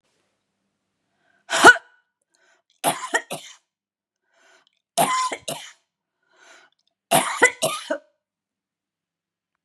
{
  "cough_length": "9.6 s",
  "cough_amplitude": 32767,
  "cough_signal_mean_std_ratio": 0.25,
  "survey_phase": "beta (2021-08-13 to 2022-03-07)",
  "age": "65+",
  "gender": "Female",
  "wearing_mask": "No",
  "symptom_abdominal_pain": true,
  "symptom_fatigue": true,
  "symptom_headache": true,
  "smoker_status": "Never smoked",
  "respiratory_condition_asthma": false,
  "respiratory_condition_other": false,
  "recruitment_source": "Test and Trace",
  "submission_delay": "3 days",
  "covid_test_result": "Positive",
  "covid_test_method": "RT-qPCR",
  "covid_ct_value": 30.1,
  "covid_ct_gene": "ORF1ab gene"
}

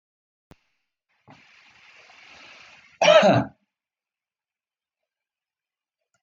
{
  "cough_length": "6.2 s",
  "cough_amplitude": 21106,
  "cough_signal_mean_std_ratio": 0.22,
  "survey_phase": "beta (2021-08-13 to 2022-03-07)",
  "age": "45-64",
  "gender": "Male",
  "wearing_mask": "No",
  "symptom_none": true,
  "smoker_status": "Never smoked",
  "respiratory_condition_asthma": false,
  "respiratory_condition_other": false,
  "recruitment_source": "REACT",
  "submission_delay": "0 days",
  "covid_test_result": "Negative",
  "covid_test_method": "RT-qPCR"
}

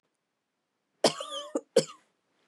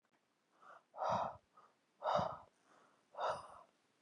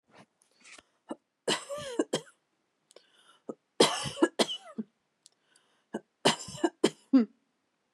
{
  "cough_length": "2.5 s",
  "cough_amplitude": 13381,
  "cough_signal_mean_std_ratio": 0.25,
  "exhalation_length": "4.0 s",
  "exhalation_amplitude": 2281,
  "exhalation_signal_mean_std_ratio": 0.41,
  "three_cough_length": "7.9 s",
  "three_cough_amplitude": 14507,
  "three_cough_signal_mean_std_ratio": 0.3,
  "survey_phase": "beta (2021-08-13 to 2022-03-07)",
  "age": "18-44",
  "gender": "Female",
  "wearing_mask": "No",
  "symptom_none": true,
  "smoker_status": "Current smoker (1 to 10 cigarettes per day)",
  "respiratory_condition_asthma": false,
  "respiratory_condition_other": false,
  "recruitment_source": "REACT",
  "submission_delay": "2 days",
  "covid_test_result": "Negative",
  "covid_test_method": "RT-qPCR",
  "influenza_a_test_result": "Negative",
  "influenza_b_test_result": "Negative"
}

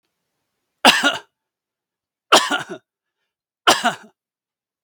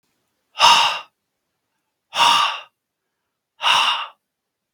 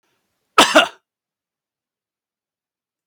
{
  "three_cough_length": "4.8 s",
  "three_cough_amplitude": 32768,
  "three_cough_signal_mean_std_ratio": 0.29,
  "exhalation_length": "4.7 s",
  "exhalation_amplitude": 32732,
  "exhalation_signal_mean_std_ratio": 0.4,
  "cough_length": "3.1 s",
  "cough_amplitude": 32768,
  "cough_signal_mean_std_ratio": 0.21,
  "survey_phase": "beta (2021-08-13 to 2022-03-07)",
  "age": "45-64",
  "gender": "Male",
  "wearing_mask": "No",
  "symptom_none": true,
  "smoker_status": "Ex-smoker",
  "respiratory_condition_asthma": false,
  "respiratory_condition_other": false,
  "recruitment_source": "REACT",
  "submission_delay": "1 day",
  "covid_test_result": "Negative",
  "covid_test_method": "RT-qPCR",
  "influenza_a_test_result": "Negative",
  "influenza_b_test_result": "Negative"
}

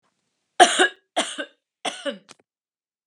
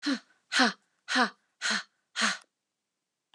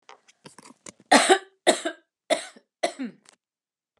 {
  "three_cough_length": "3.1 s",
  "three_cough_amplitude": 32590,
  "three_cough_signal_mean_std_ratio": 0.29,
  "exhalation_length": "3.3 s",
  "exhalation_amplitude": 12227,
  "exhalation_signal_mean_std_ratio": 0.41,
  "cough_length": "4.0 s",
  "cough_amplitude": 25296,
  "cough_signal_mean_std_ratio": 0.3,
  "survey_phase": "beta (2021-08-13 to 2022-03-07)",
  "age": "45-64",
  "gender": "Female",
  "wearing_mask": "No",
  "symptom_change_to_sense_of_smell_or_taste": true,
  "smoker_status": "Never smoked",
  "respiratory_condition_asthma": false,
  "respiratory_condition_other": false,
  "recruitment_source": "REACT",
  "submission_delay": "2 days",
  "covid_test_result": "Negative",
  "covid_test_method": "RT-qPCR"
}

